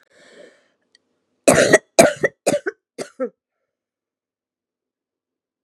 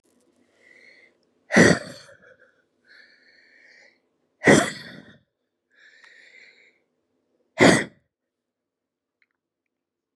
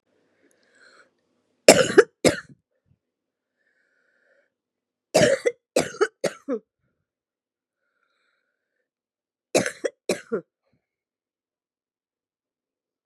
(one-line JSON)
{"cough_length": "5.6 s", "cough_amplitude": 32768, "cough_signal_mean_std_ratio": 0.26, "exhalation_length": "10.2 s", "exhalation_amplitude": 31315, "exhalation_signal_mean_std_ratio": 0.22, "three_cough_length": "13.1 s", "three_cough_amplitude": 32768, "three_cough_signal_mean_std_ratio": 0.21, "survey_phase": "beta (2021-08-13 to 2022-03-07)", "age": "45-64", "gender": "Female", "wearing_mask": "No", "symptom_cough_any": true, "symptom_runny_or_blocked_nose": true, "symptom_fatigue": true, "symptom_headache": true, "symptom_change_to_sense_of_smell_or_taste": true, "symptom_other": true, "symptom_onset": "3 days", "smoker_status": "Never smoked", "respiratory_condition_asthma": true, "respiratory_condition_other": false, "recruitment_source": "Test and Trace", "submission_delay": "1 day", "covid_test_result": "Positive", "covid_test_method": "RT-qPCR", "covid_ct_value": 17.8, "covid_ct_gene": "ORF1ab gene"}